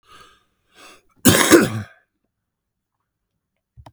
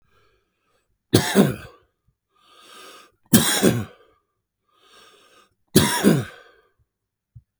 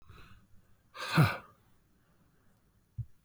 {"cough_length": "3.9 s", "cough_amplitude": 32768, "cough_signal_mean_std_ratio": 0.27, "three_cough_length": "7.6 s", "three_cough_amplitude": 32768, "three_cough_signal_mean_std_ratio": 0.32, "exhalation_length": "3.2 s", "exhalation_amplitude": 7068, "exhalation_signal_mean_std_ratio": 0.27, "survey_phase": "beta (2021-08-13 to 2022-03-07)", "age": "45-64", "gender": "Male", "wearing_mask": "No", "symptom_cough_any": true, "symptom_runny_or_blocked_nose": true, "symptom_shortness_of_breath": true, "symptom_sore_throat": true, "symptom_fatigue": true, "symptom_headache": true, "symptom_change_to_sense_of_smell_or_taste": true, "symptom_loss_of_taste": true, "symptom_onset": "1 day", "smoker_status": "Never smoked", "respiratory_condition_asthma": true, "respiratory_condition_other": false, "recruitment_source": "Test and Trace", "submission_delay": "1 day", "covid_test_result": "Positive", "covid_test_method": "RT-qPCR", "covid_ct_value": 13.0, "covid_ct_gene": "ORF1ab gene", "covid_ct_mean": 13.2, "covid_viral_load": "48000000 copies/ml", "covid_viral_load_category": "High viral load (>1M copies/ml)"}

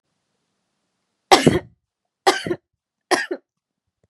{"three_cough_length": "4.1 s", "three_cough_amplitude": 32768, "three_cough_signal_mean_std_ratio": 0.26, "survey_phase": "beta (2021-08-13 to 2022-03-07)", "age": "18-44", "gender": "Female", "wearing_mask": "No", "symptom_diarrhoea": true, "smoker_status": "Never smoked", "respiratory_condition_asthma": false, "respiratory_condition_other": false, "recruitment_source": "Test and Trace", "submission_delay": "3 days", "covid_test_result": "Negative", "covid_test_method": "RT-qPCR"}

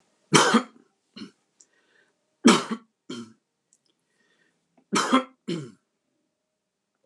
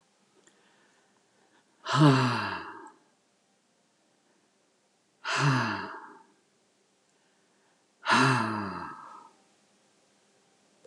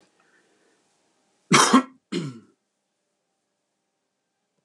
{"three_cough_length": "7.1 s", "three_cough_amplitude": 28442, "three_cough_signal_mean_std_ratio": 0.27, "exhalation_length": "10.9 s", "exhalation_amplitude": 13227, "exhalation_signal_mean_std_ratio": 0.34, "cough_length": "4.6 s", "cough_amplitude": 24662, "cough_signal_mean_std_ratio": 0.23, "survey_phase": "beta (2021-08-13 to 2022-03-07)", "age": "65+", "gender": "Male", "wearing_mask": "No", "symptom_none": true, "smoker_status": "Never smoked", "respiratory_condition_asthma": false, "respiratory_condition_other": false, "recruitment_source": "REACT", "submission_delay": "7 days", "covid_test_result": "Negative", "covid_test_method": "RT-qPCR"}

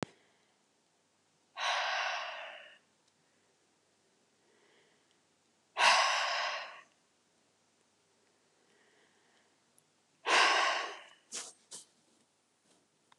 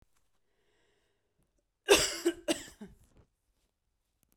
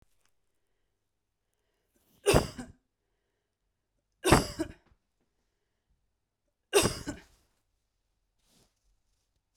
{"exhalation_length": "13.2 s", "exhalation_amplitude": 7774, "exhalation_signal_mean_std_ratio": 0.34, "cough_length": "4.4 s", "cough_amplitude": 10795, "cough_signal_mean_std_ratio": 0.24, "three_cough_length": "9.6 s", "three_cough_amplitude": 15729, "three_cough_signal_mean_std_ratio": 0.21, "survey_phase": "beta (2021-08-13 to 2022-03-07)", "age": "18-44", "gender": "Female", "wearing_mask": "No", "symptom_none": true, "symptom_onset": "3 days", "smoker_status": "Ex-smoker", "respiratory_condition_asthma": false, "respiratory_condition_other": false, "recruitment_source": "REACT", "submission_delay": "4 days", "covid_test_result": "Negative", "covid_test_method": "RT-qPCR"}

